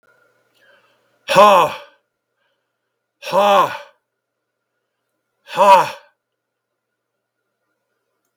{"exhalation_length": "8.4 s", "exhalation_amplitude": 32766, "exhalation_signal_mean_std_ratio": 0.3, "survey_phase": "beta (2021-08-13 to 2022-03-07)", "age": "65+", "gender": "Male", "wearing_mask": "No", "symptom_runny_or_blocked_nose": true, "smoker_status": "Never smoked", "respiratory_condition_asthma": false, "respiratory_condition_other": false, "recruitment_source": "REACT", "submission_delay": "2 days", "covid_test_result": "Negative", "covid_test_method": "RT-qPCR", "influenza_a_test_result": "Negative", "influenza_b_test_result": "Negative"}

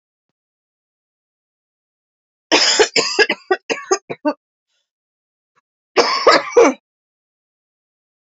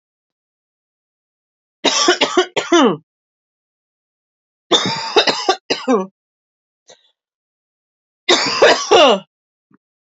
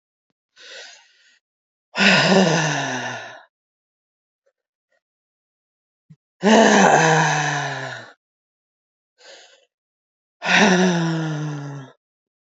{"cough_length": "8.3 s", "cough_amplitude": 29647, "cough_signal_mean_std_ratio": 0.33, "three_cough_length": "10.2 s", "three_cough_amplitude": 32767, "three_cough_signal_mean_std_ratio": 0.39, "exhalation_length": "12.5 s", "exhalation_amplitude": 32768, "exhalation_signal_mean_std_ratio": 0.44, "survey_phase": "alpha (2021-03-01 to 2021-08-12)", "age": "45-64", "gender": "Female", "wearing_mask": "No", "symptom_new_continuous_cough": true, "symptom_diarrhoea": true, "symptom_fatigue": true, "symptom_fever_high_temperature": true, "symptom_onset": "2 days", "smoker_status": "Never smoked", "respiratory_condition_asthma": false, "respiratory_condition_other": false, "recruitment_source": "Test and Trace", "submission_delay": "1 day", "covid_test_result": "Positive", "covid_test_method": "RT-qPCR", "covid_ct_value": 15.1, "covid_ct_gene": "ORF1ab gene", "covid_ct_mean": 15.6, "covid_viral_load": "7500000 copies/ml", "covid_viral_load_category": "High viral load (>1M copies/ml)"}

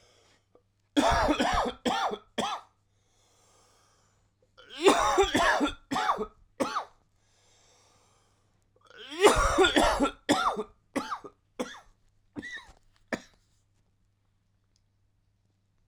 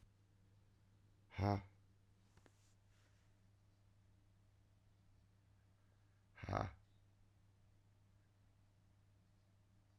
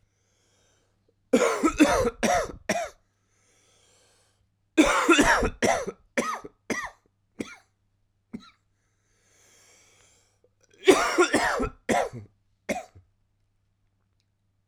{"three_cough_length": "15.9 s", "three_cough_amplitude": 15968, "three_cough_signal_mean_std_ratio": 0.41, "exhalation_length": "10.0 s", "exhalation_amplitude": 2473, "exhalation_signal_mean_std_ratio": 0.26, "cough_length": "14.7 s", "cough_amplitude": 21687, "cough_signal_mean_std_ratio": 0.38, "survey_phase": "alpha (2021-03-01 to 2021-08-12)", "age": "45-64", "gender": "Male", "wearing_mask": "No", "symptom_cough_any": true, "symptom_fatigue": true, "symptom_change_to_sense_of_smell_or_taste": true, "symptom_loss_of_taste": true, "symptom_onset": "2 days", "smoker_status": "Never smoked", "respiratory_condition_asthma": true, "respiratory_condition_other": false, "recruitment_source": "Test and Trace", "submission_delay": "1 day", "covid_test_result": "Positive", "covid_test_method": "RT-qPCR", "covid_ct_value": 17.9, "covid_ct_gene": "ORF1ab gene", "covid_ct_mean": 18.4, "covid_viral_load": "910000 copies/ml", "covid_viral_load_category": "Low viral load (10K-1M copies/ml)"}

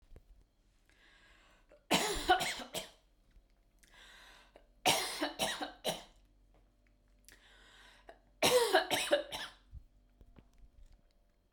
{"three_cough_length": "11.5 s", "three_cough_amplitude": 6469, "three_cough_signal_mean_std_ratio": 0.37, "survey_phase": "beta (2021-08-13 to 2022-03-07)", "age": "18-44", "gender": "Female", "wearing_mask": "No", "symptom_none": true, "symptom_onset": "12 days", "smoker_status": "Never smoked", "respiratory_condition_asthma": false, "respiratory_condition_other": false, "recruitment_source": "REACT", "submission_delay": "3 days", "covid_test_result": "Negative", "covid_test_method": "RT-qPCR", "influenza_a_test_result": "Unknown/Void", "influenza_b_test_result": "Unknown/Void"}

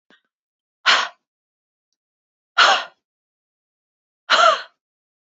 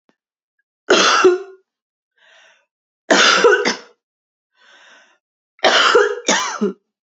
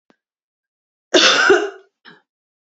{"exhalation_length": "5.3 s", "exhalation_amplitude": 28139, "exhalation_signal_mean_std_ratio": 0.29, "three_cough_length": "7.2 s", "three_cough_amplitude": 32768, "three_cough_signal_mean_std_ratio": 0.44, "cough_length": "2.6 s", "cough_amplitude": 30542, "cough_signal_mean_std_ratio": 0.37, "survey_phase": "beta (2021-08-13 to 2022-03-07)", "age": "45-64", "gender": "Female", "wearing_mask": "No", "symptom_cough_any": true, "symptom_runny_or_blocked_nose": true, "symptom_sore_throat": true, "symptom_fatigue": true, "symptom_fever_high_temperature": true, "symptom_headache": true, "symptom_onset": "2 days", "smoker_status": "Never smoked", "respiratory_condition_asthma": true, "respiratory_condition_other": false, "recruitment_source": "Test and Trace", "submission_delay": "1 day", "covid_test_result": "Positive", "covid_test_method": "RT-qPCR", "covid_ct_value": 26.6, "covid_ct_gene": "ORF1ab gene"}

